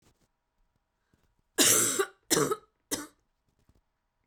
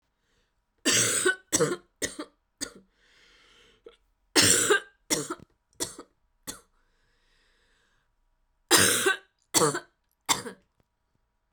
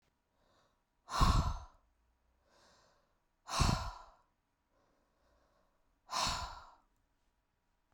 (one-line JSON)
{"cough_length": "4.3 s", "cough_amplitude": 13220, "cough_signal_mean_std_ratio": 0.34, "three_cough_length": "11.5 s", "three_cough_amplitude": 22288, "three_cough_signal_mean_std_ratio": 0.35, "exhalation_length": "7.9 s", "exhalation_amplitude": 5105, "exhalation_signal_mean_std_ratio": 0.31, "survey_phase": "beta (2021-08-13 to 2022-03-07)", "age": "18-44", "gender": "Female", "wearing_mask": "No", "symptom_sore_throat": true, "smoker_status": "Never smoked", "respiratory_condition_asthma": true, "respiratory_condition_other": false, "recruitment_source": "REACT", "submission_delay": "4 days", "covid_test_result": "Negative", "covid_test_method": "RT-qPCR"}